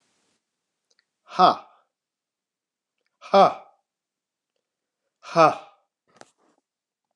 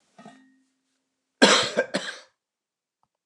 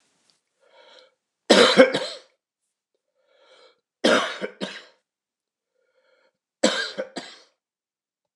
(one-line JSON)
{"exhalation_length": "7.2 s", "exhalation_amplitude": 27179, "exhalation_signal_mean_std_ratio": 0.22, "cough_length": "3.3 s", "cough_amplitude": 28254, "cough_signal_mean_std_ratio": 0.28, "three_cough_length": "8.4 s", "three_cough_amplitude": 29203, "three_cough_signal_mean_std_ratio": 0.27, "survey_phase": "beta (2021-08-13 to 2022-03-07)", "age": "65+", "gender": "Male", "wearing_mask": "No", "symptom_none": true, "smoker_status": "Ex-smoker", "respiratory_condition_asthma": false, "respiratory_condition_other": false, "recruitment_source": "REACT", "submission_delay": "1 day", "covid_test_result": "Negative", "covid_test_method": "RT-qPCR"}